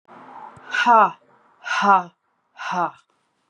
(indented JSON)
{
  "exhalation_length": "3.5 s",
  "exhalation_amplitude": 25935,
  "exhalation_signal_mean_std_ratio": 0.4,
  "survey_phase": "beta (2021-08-13 to 2022-03-07)",
  "age": "45-64",
  "gender": "Female",
  "wearing_mask": "No",
  "symptom_none": true,
  "smoker_status": "Never smoked",
  "respiratory_condition_asthma": false,
  "respiratory_condition_other": false,
  "recruitment_source": "REACT",
  "submission_delay": "1 day",
  "covid_test_result": "Negative",
  "covid_test_method": "RT-qPCR"
}